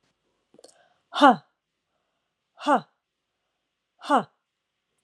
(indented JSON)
{
  "exhalation_length": "5.0 s",
  "exhalation_amplitude": 28230,
  "exhalation_signal_mean_std_ratio": 0.22,
  "survey_phase": "alpha (2021-03-01 to 2021-08-12)",
  "age": "45-64",
  "gender": "Female",
  "wearing_mask": "No",
  "symptom_none": true,
  "smoker_status": "Never smoked",
  "respiratory_condition_asthma": false,
  "respiratory_condition_other": false,
  "recruitment_source": "REACT",
  "submission_delay": "2 days",
  "covid_test_result": "Negative",
  "covid_test_method": "RT-qPCR"
}